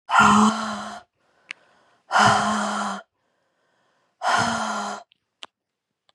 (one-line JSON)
{"exhalation_length": "6.1 s", "exhalation_amplitude": 24077, "exhalation_signal_mean_std_ratio": 0.47, "survey_phase": "beta (2021-08-13 to 2022-03-07)", "age": "18-44", "gender": "Female", "wearing_mask": "No", "symptom_new_continuous_cough": true, "symptom_runny_or_blocked_nose": true, "symptom_sore_throat": true, "symptom_fatigue": true, "symptom_headache": true, "symptom_onset": "4 days", "smoker_status": "Never smoked", "respiratory_condition_asthma": false, "respiratory_condition_other": true, "recruitment_source": "Test and Trace", "submission_delay": "2 days", "covid_test_result": "Positive", "covid_test_method": "RT-qPCR", "covid_ct_value": 21.4, "covid_ct_gene": "ORF1ab gene", "covid_ct_mean": 21.8, "covid_viral_load": "71000 copies/ml", "covid_viral_load_category": "Low viral load (10K-1M copies/ml)"}